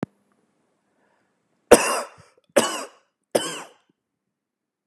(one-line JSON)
{"three_cough_length": "4.9 s", "three_cough_amplitude": 32768, "three_cough_signal_mean_std_ratio": 0.23, "survey_phase": "beta (2021-08-13 to 2022-03-07)", "age": "18-44", "gender": "Male", "wearing_mask": "No", "symptom_none": true, "smoker_status": "Never smoked", "respiratory_condition_asthma": false, "respiratory_condition_other": false, "recruitment_source": "REACT", "submission_delay": "1 day", "covid_test_result": "Negative", "covid_test_method": "RT-qPCR", "influenza_a_test_result": "Negative", "influenza_b_test_result": "Negative"}